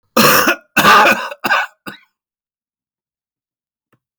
{
  "cough_length": "4.2 s",
  "cough_amplitude": 32768,
  "cough_signal_mean_std_ratio": 0.43,
  "survey_phase": "beta (2021-08-13 to 2022-03-07)",
  "age": "65+",
  "gender": "Male",
  "wearing_mask": "No",
  "symptom_cough_any": true,
  "symptom_runny_or_blocked_nose": true,
  "symptom_onset": "12 days",
  "smoker_status": "Ex-smoker",
  "respiratory_condition_asthma": false,
  "respiratory_condition_other": false,
  "recruitment_source": "REACT",
  "submission_delay": "1 day",
  "covid_test_result": "Negative",
  "covid_test_method": "RT-qPCR",
  "influenza_a_test_result": "Negative",
  "influenza_b_test_result": "Negative"
}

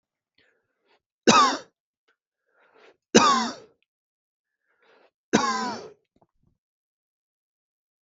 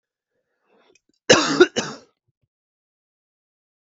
{
  "three_cough_length": "8.0 s",
  "three_cough_amplitude": 32016,
  "three_cough_signal_mean_std_ratio": 0.27,
  "cough_length": "3.8 s",
  "cough_amplitude": 32768,
  "cough_signal_mean_std_ratio": 0.23,
  "survey_phase": "beta (2021-08-13 to 2022-03-07)",
  "age": "18-44",
  "gender": "Male",
  "wearing_mask": "No",
  "symptom_cough_any": true,
  "symptom_sore_throat": true,
  "symptom_fatigue": true,
  "symptom_headache": true,
  "symptom_onset": "3 days",
  "smoker_status": "Never smoked",
  "respiratory_condition_asthma": false,
  "respiratory_condition_other": false,
  "recruitment_source": "Test and Trace",
  "submission_delay": "2 days",
  "covid_test_result": "Positive",
  "covid_test_method": "ePCR"
}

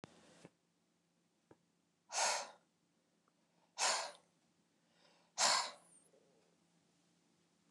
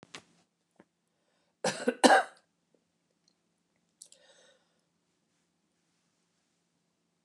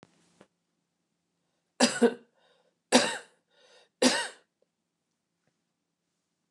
{
  "exhalation_length": "7.7 s",
  "exhalation_amplitude": 3317,
  "exhalation_signal_mean_std_ratio": 0.29,
  "cough_length": "7.2 s",
  "cough_amplitude": 16578,
  "cough_signal_mean_std_ratio": 0.17,
  "three_cough_length": "6.5 s",
  "three_cough_amplitude": 19586,
  "three_cough_signal_mean_std_ratio": 0.24,
  "survey_phase": "beta (2021-08-13 to 2022-03-07)",
  "age": "65+",
  "gender": "Female",
  "wearing_mask": "No",
  "symptom_cough_any": true,
  "symptom_shortness_of_breath": true,
  "smoker_status": "Ex-smoker",
  "respiratory_condition_asthma": true,
  "respiratory_condition_other": false,
  "recruitment_source": "REACT",
  "submission_delay": "8 days",
  "covid_test_result": "Negative",
  "covid_test_method": "RT-qPCR"
}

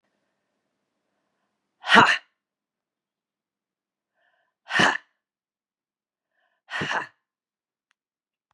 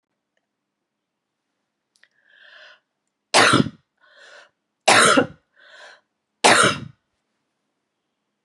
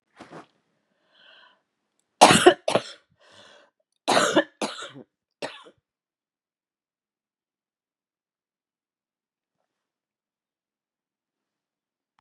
{
  "exhalation_length": "8.5 s",
  "exhalation_amplitude": 32767,
  "exhalation_signal_mean_std_ratio": 0.21,
  "three_cough_length": "8.4 s",
  "three_cough_amplitude": 30894,
  "three_cough_signal_mean_std_ratio": 0.28,
  "cough_length": "12.2 s",
  "cough_amplitude": 32653,
  "cough_signal_mean_std_ratio": 0.19,
  "survey_phase": "beta (2021-08-13 to 2022-03-07)",
  "age": "65+",
  "gender": "Female",
  "wearing_mask": "No",
  "symptom_new_continuous_cough": true,
  "symptom_sore_throat": true,
  "symptom_fatigue": true,
  "symptom_headache": true,
  "symptom_onset": "5 days",
  "smoker_status": "Ex-smoker",
  "respiratory_condition_asthma": false,
  "respiratory_condition_other": false,
  "recruitment_source": "Test and Trace",
  "submission_delay": "1 day",
  "covid_test_result": "Negative",
  "covid_test_method": "LAMP"
}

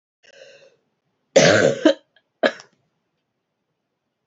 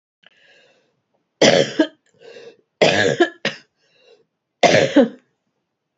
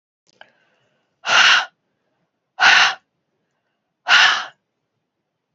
{
  "cough_length": "4.3 s",
  "cough_amplitude": 30595,
  "cough_signal_mean_std_ratio": 0.29,
  "three_cough_length": "6.0 s",
  "three_cough_amplitude": 31599,
  "three_cough_signal_mean_std_ratio": 0.36,
  "exhalation_length": "5.5 s",
  "exhalation_amplitude": 29364,
  "exhalation_signal_mean_std_ratio": 0.35,
  "survey_phase": "beta (2021-08-13 to 2022-03-07)",
  "age": "65+",
  "gender": "Female",
  "wearing_mask": "No",
  "symptom_new_continuous_cough": true,
  "symptom_headache": true,
  "smoker_status": "Ex-smoker",
  "respiratory_condition_asthma": false,
  "respiratory_condition_other": false,
  "recruitment_source": "Test and Trace",
  "submission_delay": "4 days",
  "covid_test_result": "Positive",
  "covid_test_method": "RT-qPCR",
  "covid_ct_value": 22.8,
  "covid_ct_gene": "ORF1ab gene"
}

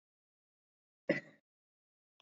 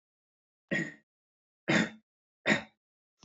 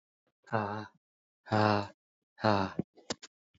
{
  "cough_length": "2.2 s",
  "cough_amplitude": 3887,
  "cough_signal_mean_std_ratio": 0.16,
  "three_cough_length": "3.2 s",
  "three_cough_amplitude": 8154,
  "three_cough_signal_mean_std_ratio": 0.31,
  "exhalation_length": "3.6 s",
  "exhalation_amplitude": 9027,
  "exhalation_signal_mean_std_ratio": 0.38,
  "survey_phase": "beta (2021-08-13 to 2022-03-07)",
  "age": "18-44",
  "gender": "Male",
  "wearing_mask": "No",
  "symptom_runny_or_blocked_nose": true,
  "symptom_sore_throat": true,
  "symptom_fatigue": true,
  "symptom_headache": true,
  "smoker_status": "Ex-smoker",
  "respiratory_condition_asthma": false,
  "respiratory_condition_other": false,
  "recruitment_source": "Test and Trace",
  "submission_delay": "2 days",
  "covid_test_result": "Positive",
  "covid_test_method": "LFT"
}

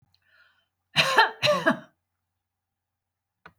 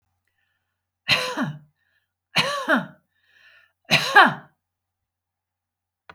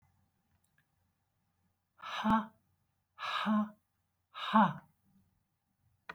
{
  "cough_length": "3.6 s",
  "cough_amplitude": 19844,
  "cough_signal_mean_std_ratio": 0.32,
  "three_cough_length": "6.1 s",
  "three_cough_amplitude": 28252,
  "three_cough_signal_mean_std_ratio": 0.31,
  "exhalation_length": "6.1 s",
  "exhalation_amplitude": 6492,
  "exhalation_signal_mean_std_ratio": 0.33,
  "survey_phase": "alpha (2021-03-01 to 2021-08-12)",
  "age": "65+",
  "gender": "Female",
  "wearing_mask": "No",
  "symptom_none": true,
  "smoker_status": "Ex-smoker",
  "respiratory_condition_asthma": false,
  "respiratory_condition_other": false,
  "recruitment_source": "REACT",
  "submission_delay": "1 day",
  "covid_test_result": "Negative",
  "covid_test_method": "RT-qPCR"
}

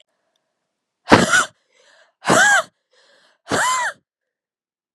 {
  "exhalation_length": "4.9 s",
  "exhalation_amplitude": 32768,
  "exhalation_signal_mean_std_ratio": 0.37,
  "survey_phase": "beta (2021-08-13 to 2022-03-07)",
  "age": "18-44",
  "gender": "Female",
  "wearing_mask": "No",
  "symptom_cough_any": true,
  "symptom_runny_or_blocked_nose": true,
  "symptom_shortness_of_breath": true,
  "symptom_sore_throat": true,
  "symptom_fatigue": true,
  "symptom_headache": true,
  "symptom_change_to_sense_of_smell_or_taste": true,
  "symptom_loss_of_taste": true,
  "smoker_status": "Never smoked",
  "respiratory_condition_asthma": true,
  "respiratory_condition_other": false,
  "recruitment_source": "Test and Trace",
  "submission_delay": "2 days",
  "covid_test_result": "Positive",
  "covid_test_method": "RT-qPCR",
  "covid_ct_value": 15.2,
  "covid_ct_gene": "ORF1ab gene",
  "covid_ct_mean": 15.5,
  "covid_viral_load": "8200000 copies/ml",
  "covid_viral_load_category": "High viral load (>1M copies/ml)"
}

